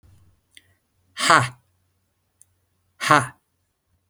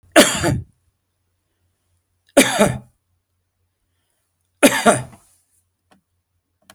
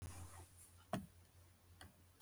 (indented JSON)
{
  "exhalation_length": "4.1 s",
  "exhalation_amplitude": 32768,
  "exhalation_signal_mean_std_ratio": 0.24,
  "three_cough_length": "6.7 s",
  "three_cough_amplitude": 32768,
  "three_cough_signal_mean_std_ratio": 0.29,
  "cough_length": "2.2 s",
  "cough_amplitude": 5190,
  "cough_signal_mean_std_ratio": 0.33,
  "survey_phase": "beta (2021-08-13 to 2022-03-07)",
  "age": "65+",
  "gender": "Male",
  "wearing_mask": "No",
  "symptom_none": true,
  "smoker_status": "Ex-smoker",
  "respiratory_condition_asthma": false,
  "respiratory_condition_other": false,
  "recruitment_source": "REACT",
  "submission_delay": "2 days",
  "covid_test_result": "Negative",
  "covid_test_method": "RT-qPCR",
  "influenza_a_test_result": "Negative",
  "influenza_b_test_result": "Negative"
}